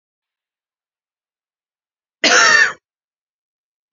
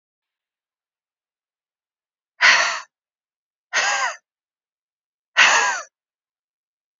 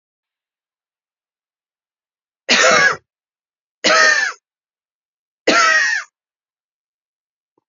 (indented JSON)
{
  "cough_length": "3.9 s",
  "cough_amplitude": 30063,
  "cough_signal_mean_std_ratio": 0.28,
  "exhalation_length": "7.0 s",
  "exhalation_amplitude": 30480,
  "exhalation_signal_mean_std_ratio": 0.31,
  "three_cough_length": "7.7 s",
  "three_cough_amplitude": 28755,
  "three_cough_signal_mean_std_ratio": 0.36,
  "survey_phase": "beta (2021-08-13 to 2022-03-07)",
  "age": "18-44",
  "gender": "Female",
  "wearing_mask": "No",
  "symptom_cough_any": true,
  "symptom_runny_or_blocked_nose": true,
  "symptom_sore_throat": true,
  "symptom_fatigue": true,
  "symptom_fever_high_temperature": true,
  "symptom_headache": true,
  "symptom_change_to_sense_of_smell_or_taste": true,
  "symptom_other": true,
  "symptom_onset": "3 days",
  "smoker_status": "Never smoked",
  "respiratory_condition_asthma": true,
  "respiratory_condition_other": false,
  "recruitment_source": "Test and Trace",
  "submission_delay": "1 day",
  "covid_test_result": "Positive",
  "covid_test_method": "RT-qPCR",
  "covid_ct_value": 18.7,
  "covid_ct_gene": "ORF1ab gene",
  "covid_ct_mean": 18.9,
  "covid_viral_load": "610000 copies/ml",
  "covid_viral_load_category": "Low viral load (10K-1M copies/ml)"
}